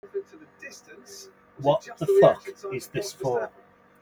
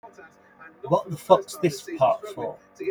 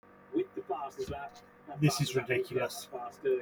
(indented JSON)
{
  "three_cough_length": "4.0 s",
  "three_cough_amplitude": 18159,
  "three_cough_signal_mean_std_ratio": 0.42,
  "exhalation_length": "2.9 s",
  "exhalation_amplitude": 22738,
  "exhalation_signal_mean_std_ratio": 0.44,
  "cough_length": "3.4 s",
  "cough_amplitude": 5937,
  "cough_signal_mean_std_ratio": 0.64,
  "survey_phase": "beta (2021-08-13 to 2022-03-07)",
  "age": "45-64",
  "gender": "Male",
  "wearing_mask": "No",
  "symptom_none": true,
  "smoker_status": "Never smoked",
  "respiratory_condition_asthma": false,
  "respiratory_condition_other": false,
  "recruitment_source": "REACT",
  "submission_delay": "2 days",
  "covid_test_result": "Negative",
  "covid_test_method": "RT-qPCR",
  "influenza_a_test_result": "Unknown/Void",
  "influenza_b_test_result": "Unknown/Void"
}